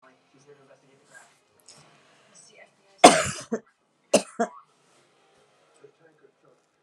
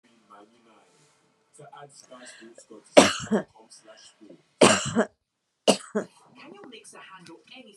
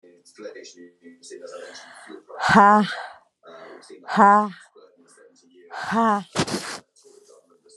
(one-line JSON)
{"cough_length": "6.8 s", "cough_amplitude": 32767, "cough_signal_mean_std_ratio": 0.18, "three_cough_length": "7.8 s", "three_cough_amplitude": 32659, "three_cough_signal_mean_std_ratio": 0.26, "exhalation_length": "7.8 s", "exhalation_amplitude": 28634, "exhalation_signal_mean_std_ratio": 0.37, "survey_phase": "beta (2021-08-13 to 2022-03-07)", "age": "45-64", "gender": "Female", "wearing_mask": "No", "symptom_cough_any": true, "symptom_sore_throat": true, "symptom_fatigue": true, "symptom_onset": "6 days", "smoker_status": "Ex-smoker", "respiratory_condition_asthma": false, "respiratory_condition_other": false, "recruitment_source": "REACT", "submission_delay": "2 days", "covid_test_result": "Negative", "covid_test_method": "RT-qPCR"}